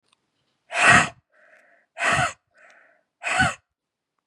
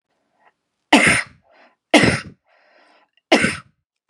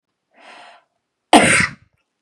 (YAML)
exhalation_length: 4.3 s
exhalation_amplitude: 27346
exhalation_signal_mean_std_ratio: 0.36
three_cough_length: 4.1 s
three_cough_amplitude: 32768
three_cough_signal_mean_std_ratio: 0.34
cough_length: 2.2 s
cough_amplitude: 32768
cough_signal_mean_std_ratio: 0.31
survey_phase: beta (2021-08-13 to 2022-03-07)
age: 18-44
gender: Female
wearing_mask: 'No'
symptom_fatigue: true
symptom_headache: true
symptom_onset: 12 days
smoker_status: Never smoked
respiratory_condition_asthma: false
respiratory_condition_other: false
recruitment_source: REACT
submission_delay: 2 days
covid_test_result: Negative
covid_test_method: RT-qPCR
influenza_a_test_result: Negative
influenza_b_test_result: Negative